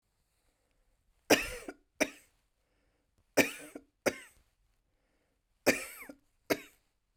{"three_cough_length": "7.2 s", "three_cough_amplitude": 11179, "three_cough_signal_mean_std_ratio": 0.23, "survey_phase": "beta (2021-08-13 to 2022-03-07)", "age": "45-64", "gender": "Female", "wearing_mask": "No", "symptom_none": true, "smoker_status": "Never smoked", "respiratory_condition_asthma": false, "respiratory_condition_other": true, "recruitment_source": "REACT", "submission_delay": "1 day", "covid_test_result": "Negative", "covid_test_method": "RT-qPCR", "influenza_a_test_result": "Unknown/Void", "influenza_b_test_result": "Unknown/Void"}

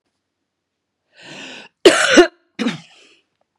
{"cough_length": "3.6 s", "cough_amplitude": 32768, "cough_signal_mean_std_ratio": 0.29, "survey_phase": "beta (2021-08-13 to 2022-03-07)", "age": "45-64", "gender": "Female", "wearing_mask": "No", "symptom_cough_any": true, "symptom_sore_throat": true, "symptom_onset": "3 days", "smoker_status": "Never smoked", "respiratory_condition_asthma": false, "respiratory_condition_other": false, "recruitment_source": "Test and Trace", "submission_delay": "2 days", "covid_test_result": "Positive", "covid_test_method": "RT-qPCR", "covid_ct_value": 20.1, "covid_ct_gene": "ORF1ab gene", "covid_ct_mean": 20.6, "covid_viral_load": "180000 copies/ml", "covid_viral_load_category": "Low viral load (10K-1M copies/ml)"}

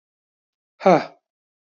{"exhalation_length": "1.6 s", "exhalation_amplitude": 26103, "exhalation_signal_mean_std_ratio": 0.24, "survey_phase": "beta (2021-08-13 to 2022-03-07)", "age": "45-64", "gender": "Male", "wearing_mask": "No", "symptom_none": true, "smoker_status": "Never smoked", "respiratory_condition_asthma": false, "respiratory_condition_other": false, "recruitment_source": "REACT", "submission_delay": "2 days", "covid_test_result": "Negative", "covid_test_method": "RT-qPCR", "influenza_a_test_result": "Negative", "influenza_b_test_result": "Negative"}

